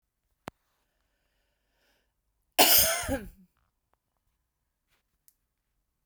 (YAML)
cough_length: 6.1 s
cough_amplitude: 19805
cough_signal_mean_std_ratio: 0.22
survey_phase: beta (2021-08-13 to 2022-03-07)
age: 45-64
gender: Female
wearing_mask: 'No'
symptom_none: true
smoker_status: Ex-smoker
respiratory_condition_asthma: false
respiratory_condition_other: false
recruitment_source: REACT
submission_delay: 1 day
covid_test_result: Negative
covid_test_method: RT-qPCR